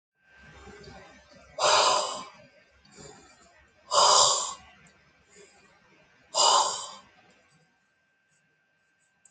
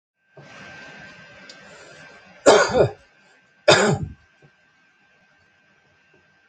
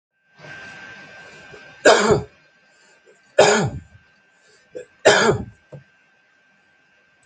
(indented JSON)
{
  "exhalation_length": "9.3 s",
  "exhalation_amplitude": 16603,
  "exhalation_signal_mean_std_ratio": 0.35,
  "cough_length": "6.5 s",
  "cough_amplitude": 30122,
  "cough_signal_mean_std_ratio": 0.29,
  "three_cough_length": "7.3 s",
  "three_cough_amplitude": 29373,
  "three_cough_signal_mean_std_ratio": 0.33,
  "survey_phase": "alpha (2021-03-01 to 2021-08-12)",
  "age": "65+",
  "gender": "Male",
  "wearing_mask": "No",
  "symptom_none": true,
  "smoker_status": "Never smoked",
  "respiratory_condition_asthma": false,
  "respiratory_condition_other": false,
  "recruitment_source": "REACT",
  "submission_delay": "2 days",
  "covid_test_result": "Negative",
  "covid_test_method": "RT-qPCR"
}